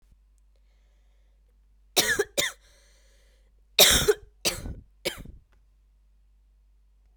{"cough_length": "7.2 s", "cough_amplitude": 28160, "cough_signal_mean_std_ratio": 0.28, "survey_phase": "alpha (2021-03-01 to 2021-08-12)", "age": "18-44", "gender": "Female", "wearing_mask": "No", "symptom_new_continuous_cough": true, "symptom_shortness_of_breath": true, "symptom_abdominal_pain": true, "symptom_fatigue": true, "symptom_fever_high_temperature": true, "symptom_headache": true, "symptom_change_to_sense_of_smell_or_taste": true, "symptom_loss_of_taste": true, "symptom_onset": "3 days", "smoker_status": "Never smoked", "respiratory_condition_asthma": false, "respiratory_condition_other": false, "recruitment_source": "Test and Trace", "submission_delay": "1 day", "covid_test_result": "Positive", "covid_test_method": "RT-qPCR"}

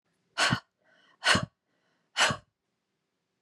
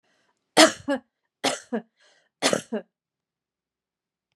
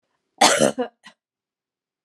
{"exhalation_length": "3.4 s", "exhalation_amplitude": 13627, "exhalation_signal_mean_std_ratio": 0.32, "three_cough_length": "4.4 s", "three_cough_amplitude": 32383, "three_cough_signal_mean_std_ratio": 0.25, "cough_length": "2.0 s", "cough_amplitude": 28974, "cough_signal_mean_std_ratio": 0.32, "survey_phase": "beta (2021-08-13 to 2022-03-07)", "age": "65+", "gender": "Female", "wearing_mask": "No", "symptom_sore_throat": true, "smoker_status": "Never smoked", "respiratory_condition_asthma": false, "respiratory_condition_other": false, "recruitment_source": "Test and Trace", "submission_delay": "1 day", "covid_test_result": "Negative", "covid_test_method": "RT-qPCR"}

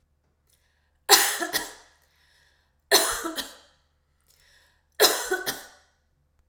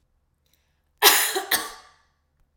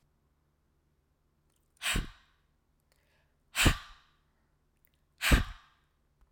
{"three_cough_length": "6.5 s", "three_cough_amplitude": 32768, "three_cough_signal_mean_std_ratio": 0.32, "cough_length": "2.6 s", "cough_amplitude": 32768, "cough_signal_mean_std_ratio": 0.33, "exhalation_length": "6.3 s", "exhalation_amplitude": 12398, "exhalation_signal_mean_std_ratio": 0.24, "survey_phase": "alpha (2021-03-01 to 2021-08-12)", "age": "45-64", "gender": "Female", "wearing_mask": "No", "symptom_cough_any": true, "symptom_change_to_sense_of_smell_or_taste": true, "symptom_onset": "7 days", "smoker_status": "Never smoked", "respiratory_condition_asthma": false, "respiratory_condition_other": false, "recruitment_source": "Test and Trace", "submission_delay": "2 days", "covid_test_result": "Positive", "covid_test_method": "RT-qPCR", "covid_ct_value": 19.8, "covid_ct_gene": "ORF1ab gene", "covid_ct_mean": 20.5, "covid_viral_load": "180000 copies/ml", "covid_viral_load_category": "Low viral load (10K-1M copies/ml)"}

